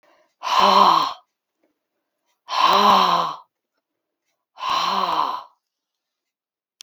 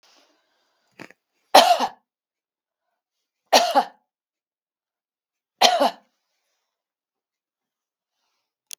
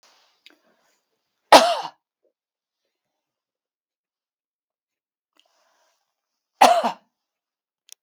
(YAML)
exhalation_length: 6.8 s
exhalation_amplitude: 28114
exhalation_signal_mean_std_ratio: 0.46
three_cough_length: 8.8 s
three_cough_amplitude: 32768
three_cough_signal_mean_std_ratio: 0.23
cough_length: 8.0 s
cough_amplitude: 32768
cough_signal_mean_std_ratio: 0.18
survey_phase: beta (2021-08-13 to 2022-03-07)
age: 65+
gender: Female
wearing_mask: 'No'
symptom_cough_any: true
symptom_sore_throat: true
symptom_onset: 3 days
smoker_status: Never smoked
respiratory_condition_asthma: false
respiratory_condition_other: false
recruitment_source: Test and Trace
submission_delay: 1 day
covid_test_result: Positive
covid_test_method: RT-qPCR
covid_ct_value: 22.4
covid_ct_gene: N gene